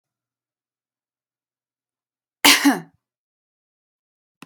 {
  "cough_length": "4.5 s",
  "cough_amplitude": 32768,
  "cough_signal_mean_std_ratio": 0.19,
  "survey_phase": "beta (2021-08-13 to 2022-03-07)",
  "age": "45-64",
  "gender": "Female",
  "wearing_mask": "No",
  "symptom_sore_throat": true,
  "smoker_status": "Never smoked",
  "respiratory_condition_asthma": false,
  "respiratory_condition_other": false,
  "recruitment_source": "REACT",
  "submission_delay": "1 day",
  "covid_test_result": "Negative",
  "covid_test_method": "RT-qPCR"
}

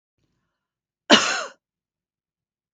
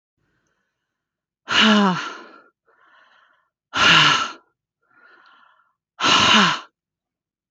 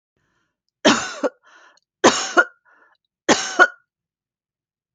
{
  "cough_length": "2.7 s",
  "cough_amplitude": 29384,
  "cough_signal_mean_std_ratio": 0.23,
  "exhalation_length": "7.5 s",
  "exhalation_amplitude": 27687,
  "exhalation_signal_mean_std_ratio": 0.39,
  "three_cough_length": "4.9 s",
  "three_cough_amplitude": 31180,
  "three_cough_signal_mean_std_ratio": 0.3,
  "survey_phase": "beta (2021-08-13 to 2022-03-07)",
  "age": "45-64",
  "gender": "Female",
  "wearing_mask": "No",
  "symptom_none": true,
  "smoker_status": "Never smoked",
  "respiratory_condition_asthma": false,
  "respiratory_condition_other": false,
  "recruitment_source": "REACT",
  "submission_delay": "2 days",
  "covid_test_result": "Negative",
  "covid_test_method": "RT-qPCR"
}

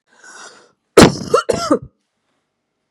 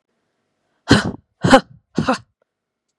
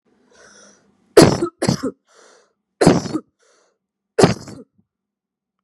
{
  "cough_length": "2.9 s",
  "cough_amplitude": 32768,
  "cough_signal_mean_std_ratio": 0.31,
  "exhalation_length": "3.0 s",
  "exhalation_amplitude": 32768,
  "exhalation_signal_mean_std_ratio": 0.29,
  "three_cough_length": "5.6 s",
  "three_cough_amplitude": 32768,
  "three_cough_signal_mean_std_ratio": 0.29,
  "survey_phase": "beta (2021-08-13 to 2022-03-07)",
  "age": "45-64",
  "gender": "Female",
  "wearing_mask": "No",
  "symptom_runny_or_blocked_nose": true,
  "symptom_onset": "2 days",
  "smoker_status": "Never smoked",
  "respiratory_condition_asthma": false,
  "respiratory_condition_other": false,
  "recruitment_source": "Test and Trace",
  "submission_delay": "1 day",
  "covid_test_result": "Positive",
  "covid_test_method": "RT-qPCR",
  "covid_ct_value": 17.1,
  "covid_ct_gene": "ORF1ab gene",
  "covid_ct_mean": 18.1,
  "covid_viral_load": "1200000 copies/ml",
  "covid_viral_load_category": "High viral load (>1M copies/ml)"
}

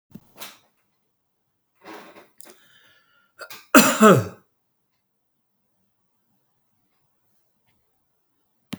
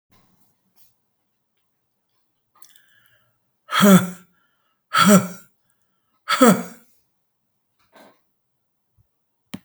{
  "cough_length": "8.8 s",
  "cough_amplitude": 32767,
  "cough_signal_mean_std_ratio": 0.19,
  "exhalation_length": "9.6 s",
  "exhalation_amplitude": 32766,
  "exhalation_signal_mean_std_ratio": 0.26,
  "survey_phase": "beta (2021-08-13 to 2022-03-07)",
  "age": "65+",
  "gender": "Male",
  "wearing_mask": "No",
  "symptom_none": true,
  "smoker_status": "Never smoked",
  "respiratory_condition_asthma": false,
  "respiratory_condition_other": false,
  "recruitment_source": "REACT",
  "submission_delay": "1 day",
  "covid_test_result": "Negative",
  "covid_test_method": "RT-qPCR"
}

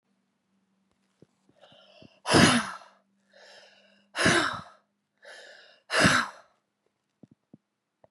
{
  "exhalation_length": "8.1 s",
  "exhalation_amplitude": 17603,
  "exhalation_signal_mean_std_ratio": 0.3,
  "survey_phase": "beta (2021-08-13 to 2022-03-07)",
  "age": "18-44",
  "gender": "Female",
  "wearing_mask": "No",
  "symptom_cough_any": true,
  "symptom_sore_throat": true,
  "symptom_onset": "4 days",
  "smoker_status": "Ex-smoker",
  "respiratory_condition_asthma": true,
  "respiratory_condition_other": false,
  "recruitment_source": "Test and Trace",
  "submission_delay": "1 day",
  "covid_test_result": "Negative",
  "covid_test_method": "RT-qPCR"
}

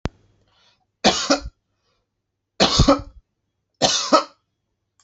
{
  "cough_length": "5.0 s",
  "cough_amplitude": 30051,
  "cough_signal_mean_std_ratio": 0.35,
  "survey_phase": "alpha (2021-03-01 to 2021-08-12)",
  "age": "45-64",
  "gender": "Male",
  "wearing_mask": "No",
  "symptom_none": true,
  "smoker_status": "Never smoked",
  "respiratory_condition_asthma": false,
  "respiratory_condition_other": false,
  "recruitment_source": "REACT",
  "submission_delay": "1 day",
  "covid_test_result": "Negative",
  "covid_test_method": "RT-qPCR"
}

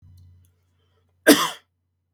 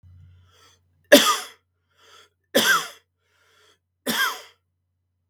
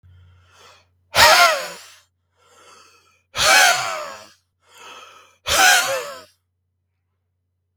{
  "cough_length": "2.1 s",
  "cough_amplitude": 32768,
  "cough_signal_mean_std_ratio": 0.23,
  "three_cough_length": "5.3 s",
  "three_cough_amplitude": 32768,
  "three_cough_signal_mean_std_ratio": 0.29,
  "exhalation_length": "7.8 s",
  "exhalation_amplitude": 32768,
  "exhalation_signal_mean_std_ratio": 0.37,
  "survey_phase": "beta (2021-08-13 to 2022-03-07)",
  "age": "18-44",
  "gender": "Male",
  "wearing_mask": "No",
  "symptom_none": true,
  "smoker_status": "Never smoked",
  "respiratory_condition_asthma": false,
  "respiratory_condition_other": false,
  "recruitment_source": "REACT",
  "submission_delay": "3 days",
  "covid_test_result": "Negative",
  "covid_test_method": "RT-qPCR",
  "influenza_a_test_result": "Negative",
  "influenza_b_test_result": "Negative"
}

